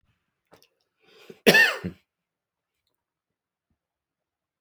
{"cough_length": "4.6 s", "cough_amplitude": 31890, "cough_signal_mean_std_ratio": 0.2, "survey_phase": "alpha (2021-03-01 to 2021-08-12)", "age": "65+", "gender": "Male", "wearing_mask": "No", "symptom_abdominal_pain": true, "symptom_onset": "8 days", "smoker_status": "Ex-smoker", "respiratory_condition_asthma": false, "respiratory_condition_other": false, "recruitment_source": "REACT", "submission_delay": "1 day", "covid_test_result": "Negative", "covid_test_method": "RT-qPCR"}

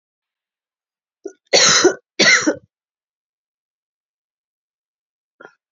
{"cough_length": "5.7 s", "cough_amplitude": 32768, "cough_signal_mean_std_ratio": 0.29, "survey_phase": "beta (2021-08-13 to 2022-03-07)", "age": "45-64", "gender": "Female", "wearing_mask": "No", "symptom_cough_any": true, "symptom_runny_or_blocked_nose": true, "symptom_sore_throat": true, "symptom_abdominal_pain": true, "symptom_fatigue": true, "symptom_fever_high_temperature": true, "symptom_headache": true, "symptom_onset": "5 days", "smoker_status": "Never smoked", "respiratory_condition_asthma": false, "respiratory_condition_other": false, "recruitment_source": "Test and Trace", "submission_delay": "2 days", "covid_test_result": "Positive", "covid_test_method": "ePCR"}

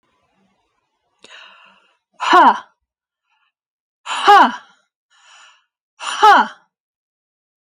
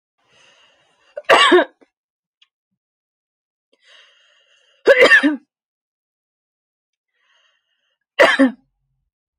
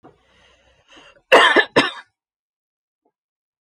{"exhalation_length": "7.7 s", "exhalation_amplitude": 31468, "exhalation_signal_mean_std_ratio": 0.29, "three_cough_length": "9.4 s", "three_cough_amplitude": 31074, "three_cough_signal_mean_std_ratio": 0.28, "cough_length": "3.7 s", "cough_amplitude": 32214, "cough_signal_mean_std_ratio": 0.27, "survey_phase": "alpha (2021-03-01 to 2021-08-12)", "age": "45-64", "gender": "Female", "wearing_mask": "No", "symptom_none": true, "smoker_status": "Never smoked", "respiratory_condition_asthma": true, "respiratory_condition_other": false, "recruitment_source": "REACT", "submission_delay": "1 day", "covid_test_result": "Negative", "covid_test_method": "RT-qPCR"}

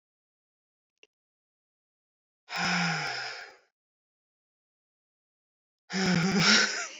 {"exhalation_length": "7.0 s", "exhalation_amplitude": 13861, "exhalation_signal_mean_std_ratio": 0.39, "survey_phase": "beta (2021-08-13 to 2022-03-07)", "age": "45-64", "gender": "Female", "wearing_mask": "No", "symptom_change_to_sense_of_smell_or_taste": true, "symptom_onset": "5 days", "smoker_status": "Ex-smoker", "respiratory_condition_asthma": false, "respiratory_condition_other": false, "recruitment_source": "Test and Trace", "submission_delay": "2 days", "covid_test_result": "Positive", "covid_test_method": "RT-qPCR", "covid_ct_value": 21.4, "covid_ct_gene": "ORF1ab gene", "covid_ct_mean": 22.0, "covid_viral_load": "62000 copies/ml", "covid_viral_load_category": "Low viral load (10K-1M copies/ml)"}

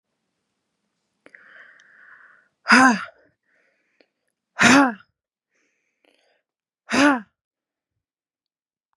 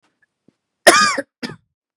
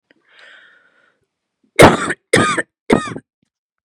{"exhalation_length": "9.0 s", "exhalation_amplitude": 30662, "exhalation_signal_mean_std_ratio": 0.25, "cough_length": "2.0 s", "cough_amplitude": 32768, "cough_signal_mean_std_ratio": 0.31, "three_cough_length": "3.8 s", "three_cough_amplitude": 32768, "three_cough_signal_mean_std_ratio": 0.31, "survey_phase": "beta (2021-08-13 to 2022-03-07)", "age": "18-44", "gender": "Female", "wearing_mask": "No", "symptom_cough_any": true, "symptom_new_continuous_cough": true, "symptom_runny_or_blocked_nose": true, "symptom_sore_throat": true, "symptom_fatigue": true, "symptom_headache": true, "symptom_onset": "5 days", "smoker_status": "Never smoked", "respiratory_condition_asthma": false, "respiratory_condition_other": false, "recruitment_source": "Test and Trace", "submission_delay": "1 day", "covid_test_result": "Negative", "covid_test_method": "RT-qPCR"}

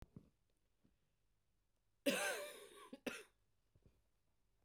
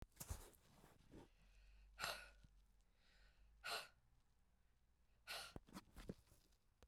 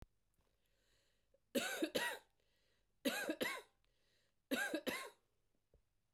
{"cough_length": "4.6 s", "cough_amplitude": 2000, "cough_signal_mean_std_ratio": 0.31, "exhalation_length": "6.9 s", "exhalation_amplitude": 1431, "exhalation_signal_mean_std_ratio": 0.46, "three_cough_length": "6.1 s", "three_cough_amplitude": 1654, "three_cough_signal_mean_std_ratio": 0.41, "survey_phase": "beta (2021-08-13 to 2022-03-07)", "age": "45-64", "gender": "Female", "wearing_mask": "No", "symptom_cough_any": true, "symptom_runny_or_blocked_nose": true, "smoker_status": "Never smoked", "respiratory_condition_asthma": false, "respiratory_condition_other": false, "recruitment_source": "Test and Trace", "submission_delay": "1 day", "covid_test_result": "Positive", "covid_test_method": "ePCR"}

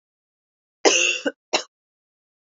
{"cough_length": "2.6 s", "cough_amplitude": 27105, "cough_signal_mean_std_ratio": 0.32, "survey_phase": "alpha (2021-03-01 to 2021-08-12)", "age": "18-44", "gender": "Female", "wearing_mask": "No", "symptom_cough_any": true, "symptom_shortness_of_breath": true, "symptom_fatigue": true, "symptom_fever_high_temperature": true, "symptom_headache": true, "symptom_change_to_sense_of_smell_or_taste": true, "symptom_loss_of_taste": true, "symptom_onset": "2 days", "smoker_status": "Never smoked", "respiratory_condition_asthma": false, "respiratory_condition_other": false, "recruitment_source": "Test and Trace", "submission_delay": "2 days", "covid_test_result": "Positive", "covid_test_method": "RT-qPCR", "covid_ct_value": 20.3, "covid_ct_gene": "ORF1ab gene", "covid_ct_mean": 20.9, "covid_viral_load": "140000 copies/ml", "covid_viral_load_category": "Low viral load (10K-1M copies/ml)"}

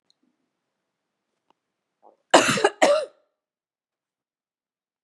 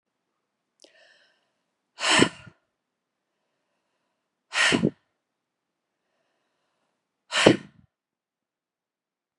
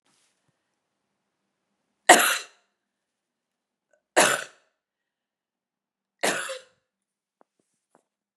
{"cough_length": "5.0 s", "cough_amplitude": 32074, "cough_signal_mean_std_ratio": 0.24, "exhalation_length": "9.4 s", "exhalation_amplitude": 32145, "exhalation_signal_mean_std_ratio": 0.22, "three_cough_length": "8.4 s", "three_cough_amplitude": 32768, "three_cough_signal_mean_std_ratio": 0.2, "survey_phase": "beta (2021-08-13 to 2022-03-07)", "age": "45-64", "gender": "Female", "wearing_mask": "No", "symptom_sore_throat": true, "symptom_onset": "10 days", "smoker_status": "Never smoked", "respiratory_condition_asthma": false, "respiratory_condition_other": false, "recruitment_source": "Test and Trace", "submission_delay": "2 days", "covid_test_result": "Positive", "covid_test_method": "RT-qPCR", "covid_ct_value": 25.5, "covid_ct_gene": "ORF1ab gene", "covid_ct_mean": 25.8, "covid_viral_load": "3500 copies/ml", "covid_viral_load_category": "Minimal viral load (< 10K copies/ml)"}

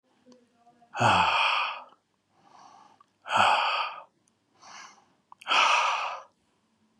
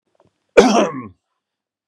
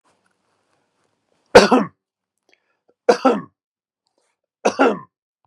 {"exhalation_length": "7.0 s", "exhalation_amplitude": 12173, "exhalation_signal_mean_std_ratio": 0.47, "cough_length": "1.9 s", "cough_amplitude": 32768, "cough_signal_mean_std_ratio": 0.34, "three_cough_length": "5.5 s", "three_cough_amplitude": 32768, "three_cough_signal_mean_std_ratio": 0.26, "survey_phase": "beta (2021-08-13 to 2022-03-07)", "age": "45-64", "gender": "Male", "wearing_mask": "No", "symptom_none": true, "smoker_status": "Never smoked", "respiratory_condition_asthma": false, "respiratory_condition_other": false, "recruitment_source": "REACT", "submission_delay": "1 day", "covid_test_result": "Negative", "covid_test_method": "RT-qPCR", "influenza_a_test_result": "Negative", "influenza_b_test_result": "Negative"}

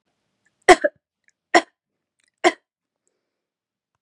{"three_cough_length": "4.0 s", "three_cough_amplitude": 32767, "three_cough_signal_mean_std_ratio": 0.17, "survey_phase": "beta (2021-08-13 to 2022-03-07)", "age": "18-44", "gender": "Female", "wearing_mask": "No", "symptom_none": true, "smoker_status": "Never smoked", "respiratory_condition_asthma": false, "respiratory_condition_other": false, "recruitment_source": "REACT", "submission_delay": "2 days", "covid_test_result": "Negative", "covid_test_method": "RT-qPCR", "influenza_a_test_result": "Negative", "influenza_b_test_result": "Negative"}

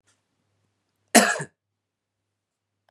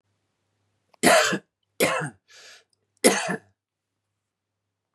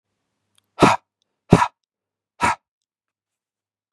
{"cough_length": "2.9 s", "cough_amplitude": 32767, "cough_signal_mean_std_ratio": 0.2, "three_cough_length": "4.9 s", "three_cough_amplitude": 23573, "three_cough_signal_mean_std_ratio": 0.32, "exhalation_length": "3.9 s", "exhalation_amplitude": 32768, "exhalation_signal_mean_std_ratio": 0.23, "survey_phase": "beta (2021-08-13 to 2022-03-07)", "age": "45-64", "gender": "Male", "wearing_mask": "No", "symptom_none": true, "smoker_status": "Never smoked", "respiratory_condition_asthma": false, "respiratory_condition_other": false, "recruitment_source": "REACT", "submission_delay": "2 days", "covid_test_result": "Negative", "covid_test_method": "RT-qPCR", "influenza_a_test_result": "Negative", "influenza_b_test_result": "Negative"}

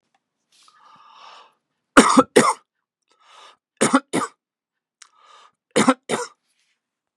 {"three_cough_length": "7.2 s", "three_cough_amplitude": 32767, "three_cough_signal_mean_std_ratio": 0.27, "survey_phase": "beta (2021-08-13 to 2022-03-07)", "age": "45-64", "gender": "Male", "wearing_mask": "No", "symptom_cough_any": true, "symptom_runny_or_blocked_nose": true, "symptom_sore_throat": true, "smoker_status": "Never smoked", "respiratory_condition_asthma": false, "respiratory_condition_other": false, "recruitment_source": "Test and Trace", "submission_delay": "2 days", "covid_test_result": "Positive", "covid_test_method": "LFT"}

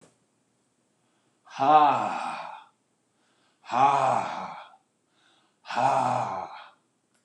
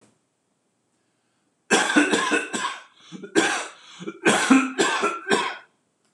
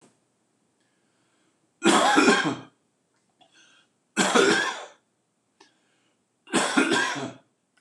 {"exhalation_length": "7.2 s", "exhalation_amplitude": 15788, "exhalation_signal_mean_std_ratio": 0.44, "cough_length": "6.1 s", "cough_amplitude": 25860, "cough_signal_mean_std_ratio": 0.51, "three_cough_length": "7.8 s", "three_cough_amplitude": 18156, "three_cough_signal_mean_std_ratio": 0.41, "survey_phase": "beta (2021-08-13 to 2022-03-07)", "age": "65+", "gender": "Male", "wearing_mask": "No", "symptom_sore_throat": true, "smoker_status": "Never smoked", "respiratory_condition_asthma": false, "respiratory_condition_other": false, "recruitment_source": "REACT", "submission_delay": "2 days", "covid_test_result": "Negative", "covid_test_method": "RT-qPCR", "influenza_a_test_result": "Negative", "influenza_b_test_result": "Negative"}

